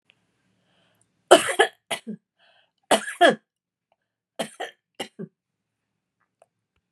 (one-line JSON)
{"three_cough_length": "6.9 s", "three_cough_amplitude": 32767, "three_cough_signal_mean_std_ratio": 0.22, "survey_phase": "beta (2021-08-13 to 2022-03-07)", "age": "65+", "gender": "Female", "wearing_mask": "No", "symptom_none": true, "smoker_status": "Never smoked", "respiratory_condition_asthma": false, "respiratory_condition_other": false, "recruitment_source": "REACT", "submission_delay": "1 day", "covid_test_result": "Negative", "covid_test_method": "RT-qPCR", "influenza_a_test_result": "Unknown/Void", "influenza_b_test_result": "Unknown/Void"}